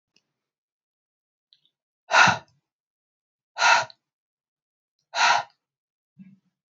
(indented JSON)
{
  "exhalation_length": "6.7 s",
  "exhalation_amplitude": 22643,
  "exhalation_signal_mean_std_ratio": 0.26,
  "survey_phase": "beta (2021-08-13 to 2022-03-07)",
  "age": "18-44",
  "gender": "Female",
  "wearing_mask": "No",
  "symptom_cough_any": true,
  "symptom_runny_or_blocked_nose": true,
  "symptom_sore_throat": true,
  "symptom_fatigue": true,
  "symptom_headache": true,
  "symptom_change_to_sense_of_smell_or_taste": true,
  "symptom_loss_of_taste": true,
  "symptom_onset": "4 days",
  "smoker_status": "Never smoked",
  "respiratory_condition_asthma": false,
  "respiratory_condition_other": false,
  "recruitment_source": "Test and Trace",
  "submission_delay": "2 days",
  "covid_test_result": "Positive",
  "covid_test_method": "RT-qPCR"
}